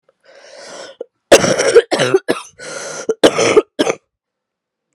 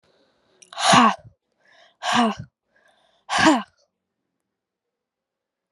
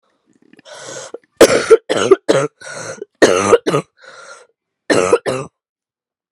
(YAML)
cough_length: 4.9 s
cough_amplitude: 32768
cough_signal_mean_std_ratio: 0.42
exhalation_length: 5.7 s
exhalation_amplitude: 30997
exhalation_signal_mean_std_ratio: 0.32
three_cough_length: 6.3 s
three_cough_amplitude: 32768
three_cough_signal_mean_std_ratio: 0.4
survey_phase: alpha (2021-03-01 to 2021-08-12)
age: 18-44
gender: Female
wearing_mask: 'No'
symptom_new_continuous_cough: true
symptom_diarrhoea: true
symptom_headache: true
symptom_change_to_sense_of_smell_or_taste: true
symptom_onset: 3 days
smoker_status: Never smoked
respiratory_condition_asthma: false
respiratory_condition_other: false
recruitment_source: Test and Trace
submission_delay: 2 days
covid_test_result: Positive
covid_test_method: RT-qPCR
covid_ct_value: 20.7
covid_ct_gene: S gene
covid_ct_mean: 21.1
covid_viral_load: 120000 copies/ml
covid_viral_load_category: Low viral load (10K-1M copies/ml)